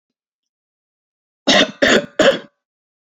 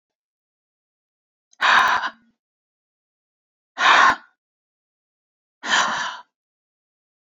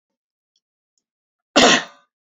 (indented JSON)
{
  "three_cough_length": "3.2 s",
  "three_cough_amplitude": 28454,
  "three_cough_signal_mean_std_ratio": 0.35,
  "exhalation_length": "7.3 s",
  "exhalation_amplitude": 26182,
  "exhalation_signal_mean_std_ratio": 0.32,
  "cough_length": "2.4 s",
  "cough_amplitude": 30779,
  "cough_signal_mean_std_ratio": 0.26,
  "survey_phase": "alpha (2021-03-01 to 2021-08-12)",
  "age": "18-44",
  "gender": "Female",
  "wearing_mask": "No",
  "symptom_none": true,
  "smoker_status": "Never smoked",
  "respiratory_condition_asthma": false,
  "respiratory_condition_other": false,
  "recruitment_source": "REACT",
  "submission_delay": "2 days",
  "covid_test_result": "Negative",
  "covid_test_method": "RT-qPCR"
}